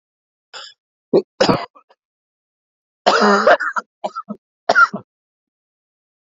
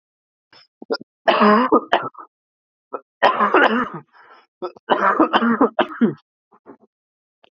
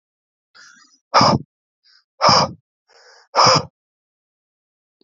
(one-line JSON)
{"cough_length": "6.3 s", "cough_amplitude": 28217, "cough_signal_mean_std_ratio": 0.34, "three_cough_length": "7.5 s", "three_cough_amplitude": 32767, "three_cough_signal_mean_std_ratio": 0.44, "exhalation_length": "5.0 s", "exhalation_amplitude": 29414, "exhalation_signal_mean_std_ratio": 0.32, "survey_phase": "beta (2021-08-13 to 2022-03-07)", "age": "18-44", "gender": "Male", "wearing_mask": "No", "symptom_cough_any": true, "symptom_runny_or_blocked_nose": true, "symptom_sore_throat": true, "symptom_abdominal_pain": true, "symptom_fatigue": true, "symptom_headache": true, "symptom_onset": "5 days", "smoker_status": "Never smoked", "respiratory_condition_asthma": false, "respiratory_condition_other": false, "recruitment_source": "Test and Trace", "submission_delay": "2 days", "covid_test_result": "Positive", "covid_test_method": "RT-qPCR", "covid_ct_value": 25.9, "covid_ct_gene": "ORF1ab gene"}